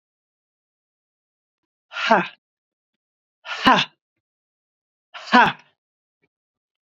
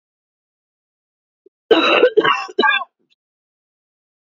{"exhalation_length": "7.0 s", "exhalation_amplitude": 31897, "exhalation_signal_mean_std_ratio": 0.24, "cough_length": "4.4 s", "cough_amplitude": 28914, "cough_signal_mean_std_ratio": 0.36, "survey_phase": "beta (2021-08-13 to 2022-03-07)", "age": "45-64", "gender": "Female", "wearing_mask": "No", "symptom_cough_any": true, "symptom_runny_or_blocked_nose": true, "symptom_sore_throat": true, "symptom_fatigue": true, "symptom_fever_high_temperature": true, "symptom_headache": true, "symptom_change_to_sense_of_smell_or_taste": true, "symptom_onset": "4 days", "smoker_status": "Never smoked", "respiratory_condition_asthma": false, "respiratory_condition_other": false, "recruitment_source": "Test and Trace", "submission_delay": "1 day", "covid_test_result": "Positive", "covid_test_method": "RT-qPCR", "covid_ct_value": 17.4, "covid_ct_gene": "ORF1ab gene", "covid_ct_mean": 18.2, "covid_viral_load": "1000000 copies/ml", "covid_viral_load_category": "High viral load (>1M copies/ml)"}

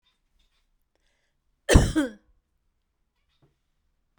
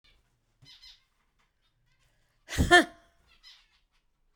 {"cough_length": "4.2 s", "cough_amplitude": 32767, "cough_signal_mean_std_ratio": 0.2, "exhalation_length": "4.4 s", "exhalation_amplitude": 15897, "exhalation_signal_mean_std_ratio": 0.19, "survey_phase": "beta (2021-08-13 to 2022-03-07)", "age": "65+", "gender": "Female", "wearing_mask": "No", "symptom_none": true, "smoker_status": "Ex-smoker", "respiratory_condition_asthma": false, "respiratory_condition_other": false, "recruitment_source": "REACT", "submission_delay": "3 days", "covid_test_result": "Negative", "covid_test_method": "RT-qPCR"}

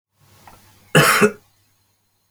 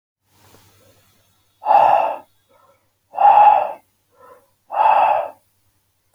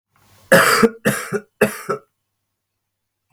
{"cough_length": "2.3 s", "cough_amplitude": 28353, "cough_signal_mean_std_ratio": 0.33, "exhalation_length": "6.1 s", "exhalation_amplitude": 27324, "exhalation_signal_mean_std_ratio": 0.42, "three_cough_length": "3.3 s", "three_cough_amplitude": 30804, "three_cough_signal_mean_std_ratio": 0.38, "survey_phase": "alpha (2021-03-01 to 2021-08-12)", "age": "18-44", "gender": "Male", "wearing_mask": "No", "symptom_none": true, "smoker_status": "Ex-smoker", "respiratory_condition_asthma": false, "respiratory_condition_other": false, "recruitment_source": "REACT", "submission_delay": "2 days", "covid_test_result": "Negative", "covid_test_method": "RT-qPCR"}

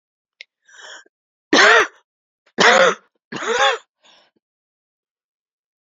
{"three_cough_length": "5.8 s", "three_cough_amplitude": 32708, "three_cough_signal_mean_std_ratio": 0.34, "survey_phase": "beta (2021-08-13 to 2022-03-07)", "age": "65+", "gender": "Female", "wearing_mask": "No", "symptom_cough_any": true, "symptom_runny_or_blocked_nose": true, "symptom_sore_throat": true, "symptom_headache": true, "smoker_status": "Ex-smoker", "respiratory_condition_asthma": false, "respiratory_condition_other": false, "recruitment_source": "Test and Trace", "submission_delay": "1 day", "covid_test_result": "Positive", "covid_test_method": "ePCR"}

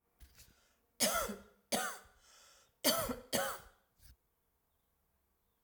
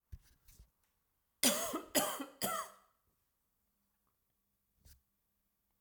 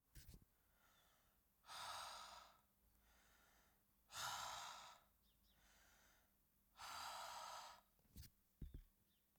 {"three_cough_length": "5.6 s", "three_cough_amplitude": 5181, "three_cough_signal_mean_std_ratio": 0.37, "cough_length": "5.8 s", "cough_amplitude": 8864, "cough_signal_mean_std_ratio": 0.3, "exhalation_length": "9.4 s", "exhalation_amplitude": 433, "exhalation_signal_mean_std_ratio": 0.55, "survey_phase": "alpha (2021-03-01 to 2021-08-12)", "age": "45-64", "gender": "Female", "wearing_mask": "No", "symptom_cough_any": true, "symptom_onset": "3 days", "smoker_status": "Never smoked", "respiratory_condition_asthma": false, "respiratory_condition_other": false, "recruitment_source": "Test and Trace", "submission_delay": "2 days", "covid_test_result": "Positive", "covid_test_method": "RT-qPCR", "covid_ct_value": 20.8, "covid_ct_gene": "ORF1ab gene", "covid_ct_mean": 21.6, "covid_viral_load": "85000 copies/ml", "covid_viral_load_category": "Low viral load (10K-1M copies/ml)"}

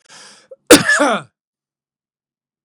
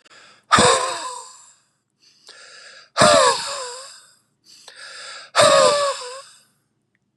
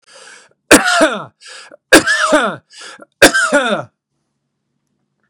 {"cough_length": "2.6 s", "cough_amplitude": 32768, "cough_signal_mean_std_ratio": 0.3, "exhalation_length": "7.2 s", "exhalation_amplitude": 31893, "exhalation_signal_mean_std_ratio": 0.42, "three_cough_length": "5.3 s", "three_cough_amplitude": 32768, "three_cough_signal_mean_std_ratio": 0.42, "survey_phase": "beta (2021-08-13 to 2022-03-07)", "age": "45-64", "gender": "Male", "wearing_mask": "No", "symptom_runny_or_blocked_nose": true, "symptom_fatigue": true, "symptom_fever_high_temperature": true, "symptom_headache": true, "symptom_change_to_sense_of_smell_or_taste": true, "symptom_onset": "4 days", "smoker_status": "Never smoked", "respiratory_condition_asthma": false, "respiratory_condition_other": false, "recruitment_source": "Test and Trace", "submission_delay": "1 day", "covid_test_result": "Positive", "covid_test_method": "RT-qPCR", "covid_ct_value": 16.2, "covid_ct_gene": "ORF1ab gene"}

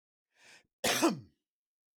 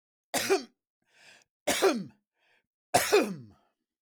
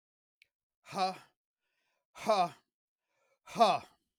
{"cough_length": "2.0 s", "cough_amplitude": 5413, "cough_signal_mean_std_ratio": 0.33, "three_cough_length": "4.0 s", "three_cough_amplitude": 11158, "three_cough_signal_mean_std_ratio": 0.38, "exhalation_length": "4.2 s", "exhalation_amplitude": 8382, "exhalation_signal_mean_std_ratio": 0.31, "survey_phase": "beta (2021-08-13 to 2022-03-07)", "age": "45-64", "gender": "Male", "wearing_mask": "No", "symptom_none": true, "smoker_status": "Never smoked", "respiratory_condition_asthma": false, "respiratory_condition_other": false, "recruitment_source": "REACT", "submission_delay": "4 days", "covid_test_result": "Negative", "covid_test_method": "RT-qPCR", "influenza_a_test_result": "Negative", "influenza_b_test_result": "Negative"}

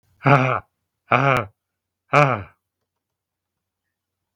{"exhalation_length": "4.4 s", "exhalation_amplitude": 32768, "exhalation_signal_mean_std_ratio": 0.32, "survey_phase": "beta (2021-08-13 to 2022-03-07)", "age": "65+", "gender": "Male", "wearing_mask": "No", "symptom_none": true, "smoker_status": "Never smoked", "respiratory_condition_asthma": true, "respiratory_condition_other": false, "recruitment_source": "REACT", "submission_delay": "2 days", "covid_test_result": "Negative", "covid_test_method": "RT-qPCR"}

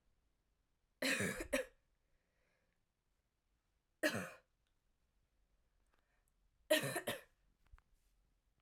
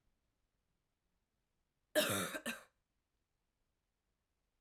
{"three_cough_length": "8.6 s", "three_cough_amplitude": 2989, "three_cough_signal_mean_std_ratio": 0.29, "cough_length": "4.6 s", "cough_amplitude": 3315, "cough_signal_mean_std_ratio": 0.25, "survey_phase": "alpha (2021-03-01 to 2021-08-12)", "age": "18-44", "gender": "Female", "wearing_mask": "No", "symptom_cough_any": true, "smoker_status": "Never smoked", "respiratory_condition_asthma": false, "respiratory_condition_other": false, "recruitment_source": "Test and Trace", "submission_delay": "1 day", "covid_test_result": "Positive", "covid_test_method": "RT-qPCR", "covid_ct_value": 30.8, "covid_ct_gene": "N gene"}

